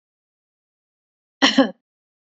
cough_length: 2.4 s
cough_amplitude: 27661
cough_signal_mean_std_ratio: 0.23
survey_phase: beta (2021-08-13 to 2022-03-07)
age: 65+
gender: Female
wearing_mask: 'No'
symptom_none: true
smoker_status: Never smoked
respiratory_condition_asthma: false
respiratory_condition_other: false
recruitment_source: REACT
submission_delay: 2 days
covid_test_result: Negative
covid_test_method: RT-qPCR
influenza_a_test_result: Negative
influenza_b_test_result: Negative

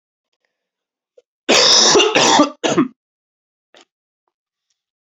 cough_length: 5.1 s
cough_amplitude: 32768
cough_signal_mean_std_ratio: 0.4
survey_phase: beta (2021-08-13 to 2022-03-07)
age: 18-44
gender: Male
wearing_mask: 'No'
symptom_cough_any: true
symptom_runny_or_blocked_nose: true
symptom_fatigue: true
symptom_fever_high_temperature: true
symptom_headache: true
symptom_change_to_sense_of_smell_or_taste: true
smoker_status: Never smoked
respiratory_condition_asthma: false
respiratory_condition_other: false
recruitment_source: Test and Trace
submission_delay: 2 days
covid_test_result: Positive
covid_test_method: RT-qPCR
covid_ct_value: 14.5
covid_ct_gene: N gene
covid_ct_mean: 14.7
covid_viral_load: 15000000 copies/ml
covid_viral_load_category: High viral load (>1M copies/ml)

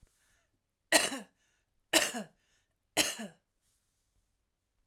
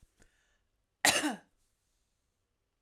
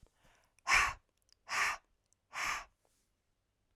three_cough_length: 4.9 s
three_cough_amplitude: 12660
three_cough_signal_mean_std_ratio: 0.27
cough_length: 2.8 s
cough_amplitude: 9405
cough_signal_mean_std_ratio: 0.24
exhalation_length: 3.8 s
exhalation_amplitude: 5667
exhalation_signal_mean_std_ratio: 0.35
survey_phase: alpha (2021-03-01 to 2021-08-12)
age: 45-64
gender: Female
wearing_mask: 'No'
symptom_fatigue: true
smoker_status: Current smoker (e-cigarettes or vapes only)
respiratory_condition_asthma: true
respiratory_condition_other: false
recruitment_source: Test and Trace
submission_delay: 1 day
covid_test_result: Positive
covid_test_method: RT-qPCR
covid_ct_value: 29.8
covid_ct_gene: N gene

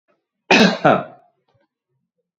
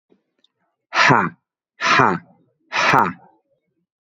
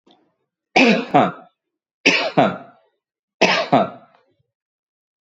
cough_length: 2.4 s
cough_amplitude: 27781
cough_signal_mean_std_ratio: 0.34
exhalation_length: 4.0 s
exhalation_amplitude: 31598
exhalation_signal_mean_std_ratio: 0.41
three_cough_length: 5.2 s
three_cough_amplitude: 29315
three_cough_signal_mean_std_ratio: 0.39
survey_phase: beta (2021-08-13 to 2022-03-07)
age: 45-64
gender: Male
wearing_mask: 'No'
symptom_none: true
symptom_onset: 7 days
smoker_status: Never smoked
respiratory_condition_asthma: false
respiratory_condition_other: false
recruitment_source: REACT
submission_delay: 2 days
covid_test_result: Negative
covid_test_method: RT-qPCR
influenza_a_test_result: Negative
influenza_b_test_result: Negative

